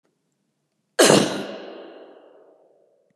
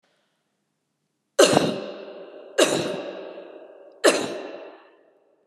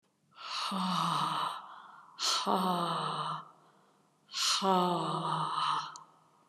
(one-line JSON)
{"cough_length": "3.2 s", "cough_amplitude": 30774, "cough_signal_mean_std_ratio": 0.3, "three_cough_length": "5.5 s", "three_cough_amplitude": 32514, "three_cough_signal_mean_std_ratio": 0.38, "exhalation_length": "6.5 s", "exhalation_amplitude": 5944, "exhalation_signal_mean_std_ratio": 0.73, "survey_phase": "beta (2021-08-13 to 2022-03-07)", "age": "65+", "gender": "Female", "wearing_mask": "No", "symptom_none": true, "smoker_status": "Never smoked", "respiratory_condition_asthma": false, "respiratory_condition_other": false, "recruitment_source": "REACT", "submission_delay": "1 day", "covid_test_result": "Negative", "covid_test_method": "RT-qPCR", "influenza_a_test_result": "Negative", "influenza_b_test_result": "Negative"}